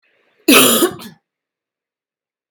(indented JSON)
{
  "cough_length": "2.5 s",
  "cough_amplitude": 32768,
  "cough_signal_mean_std_ratio": 0.34,
  "survey_phase": "beta (2021-08-13 to 2022-03-07)",
  "age": "18-44",
  "gender": "Female",
  "wearing_mask": "No",
  "symptom_cough_any": true,
  "symptom_runny_or_blocked_nose": true,
  "symptom_diarrhoea": true,
  "symptom_onset": "3 days",
  "smoker_status": "Never smoked",
  "respiratory_condition_asthma": false,
  "respiratory_condition_other": false,
  "recruitment_source": "Test and Trace",
  "submission_delay": "1 day",
  "covid_test_result": "Positive",
  "covid_test_method": "RT-qPCR",
  "covid_ct_value": 22.5,
  "covid_ct_gene": "ORF1ab gene"
}